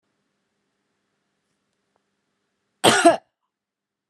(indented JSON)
{
  "cough_length": "4.1 s",
  "cough_amplitude": 30046,
  "cough_signal_mean_std_ratio": 0.21,
  "survey_phase": "beta (2021-08-13 to 2022-03-07)",
  "age": "45-64",
  "gender": "Female",
  "wearing_mask": "Yes",
  "symptom_none": true,
  "smoker_status": "Current smoker (11 or more cigarettes per day)",
  "respiratory_condition_asthma": false,
  "respiratory_condition_other": false,
  "recruitment_source": "REACT",
  "submission_delay": "5 days",
  "covid_test_result": "Negative",
  "covid_test_method": "RT-qPCR"
}